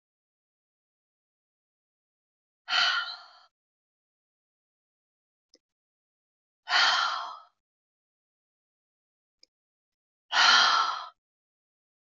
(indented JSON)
{
  "exhalation_length": "12.1 s",
  "exhalation_amplitude": 12553,
  "exhalation_signal_mean_std_ratio": 0.28,
  "survey_phase": "beta (2021-08-13 to 2022-03-07)",
  "age": "45-64",
  "gender": "Female",
  "wearing_mask": "No",
  "symptom_new_continuous_cough": true,
  "symptom_runny_or_blocked_nose": true,
  "symptom_shortness_of_breath": true,
  "symptom_sore_throat": true,
  "symptom_abdominal_pain": true,
  "symptom_fatigue": true,
  "symptom_headache": true,
  "symptom_onset": "3 days",
  "smoker_status": "Ex-smoker",
  "respiratory_condition_asthma": true,
  "respiratory_condition_other": false,
  "recruitment_source": "Test and Trace",
  "submission_delay": "2 days",
  "covid_test_result": "Positive",
  "covid_test_method": "RT-qPCR"
}